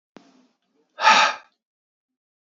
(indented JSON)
{
  "exhalation_length": "2.5 s",
  "exhalation_amplitude": 25558,
  "exhalation_signal_mean_std_ratio": 0.29,
  "survey_phase": "beta (2021-08-13 to 2022-03-07)",
  "age": "18-44",
  "gender": "Male",
  "wearing_mask": "No",
  "symptom_cough_any": true,
  "symptom_runny_or_blocked_nose": true,
  "symptom_sore_throat": true,
  "symptom_diarrhoea": true,
  "symptom_fatigue": true,
  "symptom_headache": true,
  "symptom_loss_of_taste": true,
  "symptom_onset": "4 days",
  "smoker_status": "Never smoked",
  "respiratory_condition_asthma": false,
  "respiratory_condition_other": false,
  "recruitment_source": "Test and Trace",
  "submission_delay": "1 day",
  "covid_test_result": "Positive",
  "covid_test_method": "RT-qPCR",
  "covid_ct_value": 23.9,
  "covid_ct_gene": "ORF1ab gene"
}